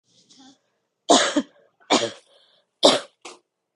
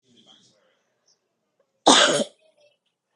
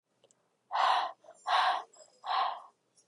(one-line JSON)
{"three_cough_length": "3.8 s", "three_cough_amplitude": 31266, "three_cough_signal_mean_std_ratio": 0.31, "cough_length": "3.2 s", "cough_amplitude": 32767, "cough_signal_mean_std_ratio": 0.26, "exhalation_length": "3.1 s", "exhalation_amplitude": 5847, "exhalation_signal_mean_std_ratio": 0.5, "survey_phase": "beta (2021-08-13 to 2022-03-07)", "age": "18-44", "gender": "Female", "wearing_mask": "No", "symptom_cough_any": true, "symptom_runny_or_blocked_nose": true, "smoker_status": "Never smoked", "respiratory_condition_asthma": false, "respiratory_condition_other": false, "recruitment_source": "REACT", "submission_delay": "4 days", "covid_test_result": "Negative", "covid_test_method": "RT-qPCR", "influenza_a_test_result": "Negative", "influenza_b_test_result": "Negative"}